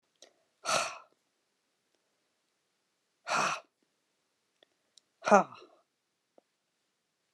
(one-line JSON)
{"exhalation_length": "7.3 s", "exhalation_amplitude": 14265, "exhalation_signal_mean_std_ratio": 0.21, "survey_phase": "beta (2021-08-13 to 2022-03-07)", "age": "45-64", "gender": "Female", "wearing_mask": "No", "symptom_cough_any": true, "symptom_runny_or_blocked_nose": true, "symptom_onset": "3 days", "smoker_status": "Never smoked", "respiratory_condition_asthma": false, "respiratory_condition_other": false, "recruitment_source": "REACT", "submission_delay": "2 days", "covid_test_result": "Negative", "covid_test_method": "RT-qPCR"}